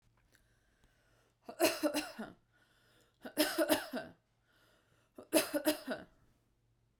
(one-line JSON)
{"three_cough_length": "7.0 s", "three_cough_amplitude": 6013, "three_cough_signal_mean_std_ratio": 0.36, "survey_phase": "beta (2021-08-13 to 2022-03-07)", "age": "18-44", "gender": "Female", "wearing_mask": "No", "symptom_runny_or_blocked_nose": true, "symptom_sore_throat": true, "smoker_status": "Never smoked", "respiratory_condition_asthma": false, "respiratory_condition_other": false, "recruitment_source": "REACT", "submission_delay": "1 day", "covid_test_result": "Negative", "covid_test_method": "RT-qPCR"}